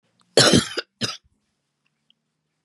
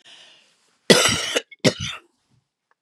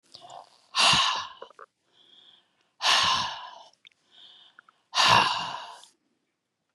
{"cough_length": "2.6 s", "cough_amplitude": 32011, "cough_signal_mean_std_ratio": 0.29, "three_cough_length": "2.8 s", "three_cough_amplitude": 32767, "three_cough_signal_mean_std_ratio": 0.34, "exhalation_length": "6.7 s", "exhalation_amplitude": 17255, "exhalation_signal_mean_std_ratio": 0.41, "survey_phase": "beta (2021-08-13 to 2022-03-07)", "age": "65+", "gender": "Female", "wearing_mask": "No", "symptom_cough_any": true, "smoker_status": "Never smoked", "respiratory_condition_asthma": false, "respiratory_condition_other": false, "recruitment_source": "REACT", "submission_delay": "1 day", "covid_test_result": "Negative", "covid_test_method": "RT-qPCR", "influenza_a_test_result": "Negative", "influenza_b_test_result": "Negative"}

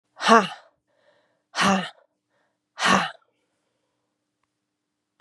{"exhalation_length": "5.2 s", "exhalation_amplitude": 30917, "exhalation_signal_mean_std_ratio": 0.29, "survey_phase": "beta (2021-08-13 to 2022-03-07)", "age": "45-64", "gender": "Female", "wearing_mask": "No", "symptom_runny_or_blocked_nose": true, "symptom_fatigue": true, "symptom_fever_high_temperature": true, "symptom_onset": "3 days", "smoker_status": "Never smoked", "respiratory_condition_asthma": false, "respiratory_condition_other": false, "recruitment_source": "Test and Trace", "submission_delay": "2 days", "covid_test_result": "Positive", "covid_test_method": "RT-qPCR", "covid_ct_value": 16.8, "covid_ct_gene": "N gene", "covid_ct_mean": 17.8, "covid_viral_load": "1400000 copies/ml", "covid_viral_load_category": "High viral load (>1M copies/ml)"}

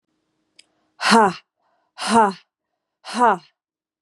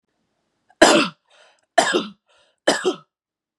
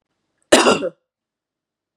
{"exhalation_length": "4.0 s", "exhalation_amplitude": 28929, "exhalation_signal_mean_std_ratio": 0.35, "three_cough_length": "3.6 s", "three_cough_amplitude": 32768, "three_cough_signal_mean_std_ratio": 0.33, "cough_length": "2.0 s", "cough_amplitude": 32768, "cough_signal_mean_std_ratio": 0.3, "survey_phase": "beta (2021-08-13 to 2022-03-07)", "age": "18-44", "gender": "Female", "wearing_mask": "No", "symptom_none": true, "smoker_status": "Ex-smoker", "respiratory_condition_asthma": false, "respiratory_condition_other": false, "recruitment_source": "REACT", "submission_delay": "4 days", "covid_test_result": "Negative", "covid_test_method": "RT-qPCR", "influenza_a_test_result": "Negative", "influenza_b_test_result": "Negative"}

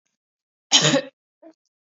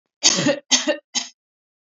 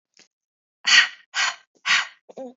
{"cough_length": "2.0 s", "cough_amplitude": 28792, "cough_signal_mean_std_ratio": 0.3, "three_cough_length": "1.9 s", "three_cough_amplitude": 32429, "three_cough_signal_mean_std_ratio": 0.44, "exhalation_length": "2.6 s", "exhalation_amplitude": 28087, "exhalation_signal_mean_std_ratio": 0.37, "survey_phase": "beta (2021-08-13 to 2022-03-07)", "age": "18-44", "gender": "Female", "wearing_mask": "No", "symptom_none": true, "smoker_status": "Never smoked", "respiratory_condition_asthma": false, "respiratory_condition_other": false, "recruitment_source": "REACT", "submission_delay": "2 days", "covid_test_result": "Negative", "covid_test_method": "RT-qPCR", "influenza_a_test_result": "Negative", "influenza_b_test_result": "Negative"}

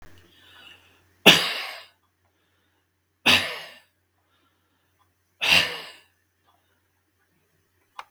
{"three_cough_length": "8.1 s", "three_cough_amplitude": 32768, "three_cough_signal_mean_std_ratio": 0.24, "survey_phase": "beta (2021-08-13 to 2022-03-07)", "age": "65+", "gender": "Male", "wearing_mask": "No", "symptom_none": true, "smoker_status": "Never smoked", "respiratory_condition_asthma": false, "respiratory_condition_other": true, "recruitment_source": "REACT", "submission_delay": "1 day", "covid_test_result": "Negative", "covid_test_method": "RT-qPCR", "influenza_a_test_result": "Negative", "influenza_b_test_result": "Negative"}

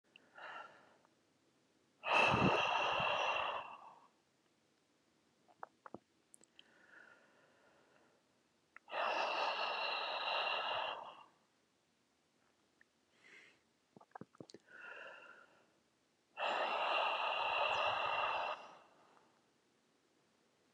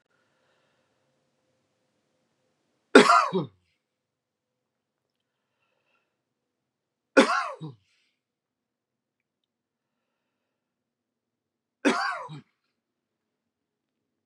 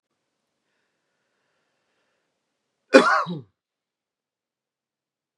{"exhalation_length": "20.7 s", "exhalation_amplitude": 3397, "exhalation_signal_mean_std_ratio": 0.48, "three_cough_length": "14.3 s", "three_cough_amplitude": 32375, "three_cough_signal_mean_std_ratio": 0.18, "cough_length": "5.4 s", "cough_amplitude": 32767, "cough_signal_mean_std_ratio": 0.18, "survey_phase": "beta (2021-08-13 to 2022-03-07)", "age": "45-64", "gender": "Male", "wearing_mask": "No", "symptom_sore_throat": true, "smoker_status": "Ex-smoker", "respiratory_condition_asthma": false, "respiratory_condition_other": false, "recruitment_source": "REACT", "submission_delay": "2 days", "covid_test_result": "Negative", "covid_test_method": "RT-qPCR"}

